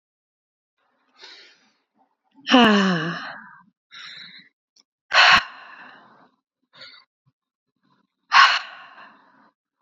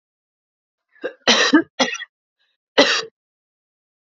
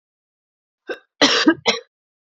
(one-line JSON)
{"exhalation_length": "9.8 s", "exhalation_amplitude": 29303, "exhalation_signal_mean_std_ratio": 0.29, "three_cough_length": "4.1 s", "three_cough_amplitude": 31380, "three_cough_signal_mean_std_ratio": 0.33, "cough_length": "2.2 s", "cough_amplitude": 31493, "cough_signal_mean_std_ratio": 0.35, "survey_phase": "beta (2021-08-13 to 2022-03-07)", "age": "18-44", "gender": "Female", "wearing_mask": "No", "symptom_cough_any": true, "symptom_runny_or_blocked_nose": true, "symptom_onset": "5 days", "smoker_status": "Ex-smoker", "respiratory_condition_asthma": false, "respiratory_condition_other": false, "recruitment_source": "Test and Trace", "submission_delay": "1 day", "covid_test_result": "Positive", "covid_test_method": "RT-qPCR", "covid_ct_value": 19.1, "covid_ct_gene": "ORF1ab gene", "covid_ct_mean": 19.4, "covid_viral_load": "440000 copies/ml", "covid_viral_load_category": "Low viral load (10K-1M copies/ml)"}